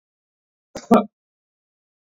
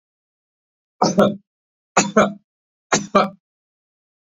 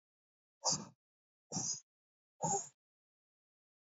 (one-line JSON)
{"cough_length": "2.0 s", "cough_amplitude": 26342, "cough_signal_mean_std_ratio": 0.2, "three_cough_length": "4.4 s", "three_cough_amplitude": 31845, "three_cough_signal_mean_std_ratio": 0.32, "exhalation_length": "3.8 s", "exhalation_amplitude": 2861, "exhalation_signal_mean_std_ratio": 0.32, "survey_phase": "beta (2021-08-13 to 2022-03-07)", "age": "45-64", "gender": "Male", "wearing_mask": "No", "symptom_none": true, "smoker_status": "Never smoked", "respiratory_condition_asthma": false, "respiratory_condition_other": false, "recruitment_source": "REACT", "submission_delay": "4 days", "covid_test_result": "Negative", "covid_test_method": "RT-qPCR", "influenza_a_test_result": "Negative", "influenza_b_test_result": "Negative"}